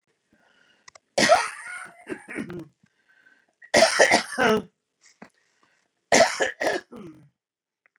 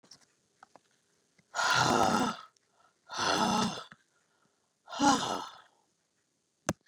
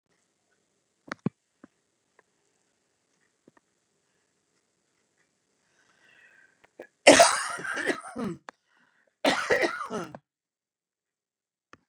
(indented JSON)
{
  "three_cough_length": "8.0 s",
  "three_cough_amplitude": 23416,
  "three_cough_signal_mean_std_ratio": 0.36,
  "exhalation_length": "6.9 s",
  "exhalation_amplitude": 9790,
  "exhalation_signal_mean_std_ratio": 0.42,
  "cough_length": "11.9 s",
  "cough_amplitude": 30080,
  "cough_signal_mean_std_ratio": 0.22,
  "survey_phase": "beta (2021-08-13 to 2022-03-07)",
  "age": "65+",
  "gender": "Female",
  "wearing_mask": "No",
  "symptom_cough_any": true,
  "symptom_runny_or_blocked_nose": true,
  "symptom_fatigue": true,
  "symptom_onset": "11 days",
  "smoker_status": "Ex-smoker",
  "respiratory_condition_asthma": false,
  "respiratory_condition_other": false,
  "recruitment_source": "REACT",
  "submission_delay": "3 days",
  "covid_test_result": "Negative",
  "covid_test_method": "RT-qPCR",
  "influenza_a_test_result": "Negative",
  "influenza_b_test_result": "Negative"
}